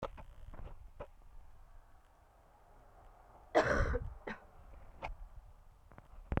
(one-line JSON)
{"cough_length": "6.4 s", "cough_amplitude": 5840, "cough_signal_mean_std_ratio": 0.41, "survey_phase": "beta (2021-08-13 to 2022-03-07)", "age": "18-44", "gender": "Female", "wearing_mask": "No", "symptom_cough_any": true, "symptom_runny_or_blocked_nose": true, "symptom_shortness_of_breath": true, "symptom_fatigue": true, "symptom_change_to_sense_of_smell_or_taste": true, "symptom_loss_of_taste": true, "symptom_onset": "3 days", "smoker_status": "Never smoked", "respiratory_condition_asthma": false, "respiratory_condition_other": false, "recruitment_source": "Test and Trace", "submission_delay": "1 day", "covid_test_result": "Positive", "covid_test_method": "RT-qPCR", "covid_ct_value": 11.7, "covid_ct_gene": "ORF1ab gene", "covid_ct_mean": 12.2, "covid_viral_load": "100000000 copies/ml", "covid_viral_load_category": "High viral load (>1M copies/ml)"}